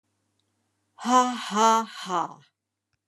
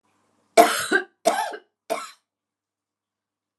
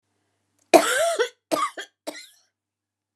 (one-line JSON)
{"exhalation_length": "3.1 s", "exhalation_amplitude": 17113, "exhalation_signal_mean_std_ratio": 0.42, "three_cough_length": "3.6 s", "three_cough_amplitude": 32627, "three_cough_signal_mean_std_ratio": 0.31, "cough_length": "3.2 s", "cough_amplitude": 32495, "cough_signal_mean_std_ratio": 0.34, "survey_phase": "alpha (2021-03-01 to 2021-08-12)", "age": "65+", "gender": "Female", "wearing_mask": "No", "symptom_none": true, "smoker_status": "Never smoked", "respiratory_condition_asthma": false, "respiratory_condition_other": false, "recruitment_source": "REACT", "submission_delay": "1 day", "covid_test_result": "Negative", "covid_test_method": "RT-qPCR"}